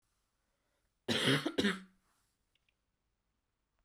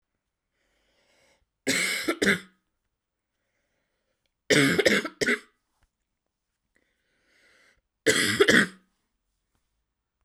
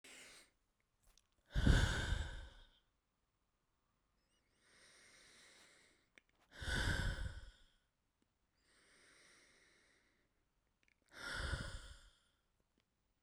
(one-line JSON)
{"cough_length": "3.8 s", "cough_amplitude": 4666, "cough_signal_mean_std_ratio": 0.31, "three_cough_length": "10.2 s", "three_cough_amplitude": 20858, "three_cough_signal_mean_std_ratio": 0.32, "exhalation_length": "13.2 s", "exhalation_amplitude": 4043, "exhalation_signal_mean_std_ratio": 0.31, "survey_phase": "beta (2021-08-13 to 2022-03-07)", "age": "18-44", "gender": "Female", "wearing_mask": "No", "symptom_cough_any": true, "symptom_new_continuous_cough": true, "symptom_shortness_of_breath": true, "symptom_sore_throat": true, "symptom_fatigue": true, "symptom_fever_high_temperature": true, "smoker_status": "Never smoked", "respiratory_condition_asthma": false, "respiratory_condition_other": false, "recruitment_source": "Test and Trace", "submission_delay": "2 days", "covid_test_result": "Positive", "covid_test_method": "LAMP"}